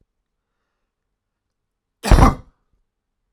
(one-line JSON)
{"cough_length": "3.3 s", "cough_amplitude": 32768, "cough_signal_mean_std_ratio": 0.22, "survey_phase": "alpha (2021-03-01 to 2021-08-12)", "age": "18-44", "gender": "Male", "wearing_mask": "No", "symptom_none": true, "symptom_onset": "13 days", "smoker_status": "Never smoked", "respiratory_condition_asthma": false, "respiratory_condition_other": false, "recruitment_source": "REACT", "submission_delay": "2 days", "covid_test_result": "Negative", "covid_test_method": "RT-qPCR"}